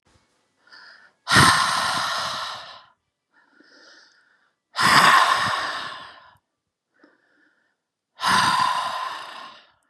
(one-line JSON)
{"exhalation_length": "9.9 s", "exhalation_amplitude": 29668, "exhalation_signal_mean_std_ratio": 0.45, "survey_phase": "beta (2021-08-13 to 2022-03-07)", "age": "18-44", "gender": "Female", "wearing_mask": "No", "symptom_none": true, "smoker_status": "Never smoked", "respiratory_condition_asthma": false, "respiratory_condition_other": false, "recruitment_source": "REACT", "submission_delay": "1 day", "covid_test_result": "Negative", "covid_test_method": "RT-qPCR", "influenza_a_test_result": "Negative", "influenza_b_test_result": "Negative"}